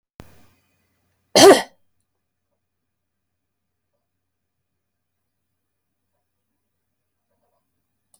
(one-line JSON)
{"cough_length": "8.2 s", "cough_amplitude": 30639, "cough_signal_mean_std_ratio": 0.14, "survey_phase": "alpha (2021-03-01 to 2021-08-12)", "age": "65+", "gender": "Female", "wearing_mask": "No", "symptom_none": true, "smoker_status": "Never smoked", "respiratory_condition_asthma": false, "respiratory_condition_other": false, "recruitment_source": "REACT", "submission_delay": "3 days", "covid_test_result": "Negative", "covid_test_method": "RT-qPCR"}